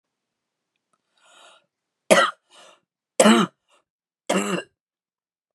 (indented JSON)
{
  "three_cough_length": "5.5 s",
  "three_cough_amplitude": 31009,
  "three_cough_signal_mean_std_ratio": 0.27,
  "survey_phase": "beta (2021-08-13 to 2022-03-07)",
  "age": "45-64",
  "gender": "Female",
  "wearing_mask": "No",
  "symptom_none": true,
  "smoker_status": "Ex-smoker",
  "respiratory_condition_asthma": false,
  "respiratory_condition_other": false,
  "recruitment_source": "REACT",
  "submission_delay": "1 day",
  "covid_test_result": "Negative",
  "covid_test_method": "RT-qPCR",
  "influenza_a_test_result": "Negative",
  "influenza_b_test_result": "Negative"
}